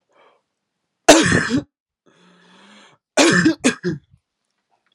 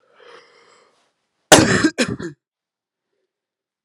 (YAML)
three_cough_length: 4.9 s
three_cough_amplitude: 32768
three_cough_signal_mean_std_ratio: 0.36
cough_length: 3.8 s
cough_amplitude: 32768
cough_signal_mean_std_ratio: 0.27
survey_phase: alpha (2021-03-01 to 2021-08-12)
age: 18-44
gender: Male
wearing_mask: 'No'
symptom_headache: true
symptom_onset: 4 days
smoker_status: Never smoked
respiratory_condition_asthma: false
respiratory_condition_other: false
recruitment_source: Test and Trace
submission_delay: 2 days
covid_test_result: Positive
covid_test_method: RT-qPCR
covid_ct_value: 19.5
covid_ct_gene: ORF1ab gene
covid_ct_mean: 20.1
covid_viral_load: 260000 copies/ml
covid_viral_load_category: Low viral load (10K-1M copies/ml)